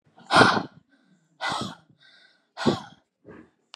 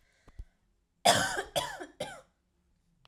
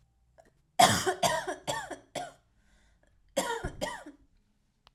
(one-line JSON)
{"exhalation_length": "3.8 s", "exhalation_amplitude": 30718, "exhalation_signal_mean_std_ratio": 0.32, "cough_length": "3.1 s", "cough_amplitude": 11455, "cough_signal_mean_std_ratio": 0.34, "three_cough_length": "4.9 s", "three_cough_amplitude": 16053, "three_cough_signal_mean_std_ratio": 0.37, "survey_phase": "alpha (2021-03-01 to 2021-08-12)", "age": "18-44", "gender": "Female", "wearing_mask": "No", "symptom_none": true, "smoker_status": "Never smoked", "respiratory_condition_asthma": false, "respiratory_condition_other": false, "recruitment_source": "REACT", "submission_delay": "1 day", "covid_test_result": "Negative", "covid_test_method": "RT-qPCR"}